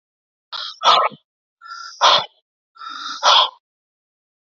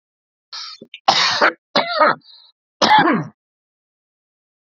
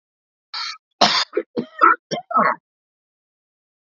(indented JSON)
{
  "exhalation_length": "4.5 s",
  "exhalation_amplitude": 31554,
  "exhalation_signal_mean_std_ratio": 0.37,
  "three_cough_length": "4.6 s",
  "three_cough_amplitude": 30161,
  "three_cough_signal_mean_std_ratio": 0.42,
  "cough_length": "3.9 s",
  "cough_amplitude": 30205,
  "cough_signal_mean_std_ratio": 0.36,
  "survey_phase": "alpha (2021-03-01 to 2021-08-12)",
  "age": "45-64",
  "gender": "Male",
  "wearing_mask": "No",
  "symptom_none": true,
  "smoker_status": "Never smoked",
  "respiratory_condition_asthma": false,
  "respiratory_condition_other": false,
  "recruitment_source": "REACT",
  "submission_delay": "2 days",
  "covid_test_result": "Negative",
  "covid_test_method": "RT-qPCR"
}